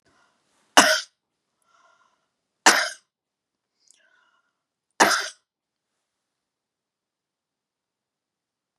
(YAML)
three_cough_length: 8.8 s
three_cough_amplitude: 32768
three_cough_signal_mean_std_ratio: 0.2
survey_phase: beta (2021-08-13 to 2022-03-07)
age: 65+
gender: Female
wearing_mask: 'No'
symptom_cough_any: true
symptom_runny_or_blocked_nose: true
symptom_sore_throat: true
symptom_fatigue: true
symptom_onset: 12 days
smoker_status: Never smoked
respiratory_condition_asthma: false
respiratory_condition_other: false
recruitment_source: REACT
submission_delay: 1 day
covid_test_result: Negative
covid_test_method: RT-qPCR
influenza_a_test_result: Negative
influenza_b_test_result: Negative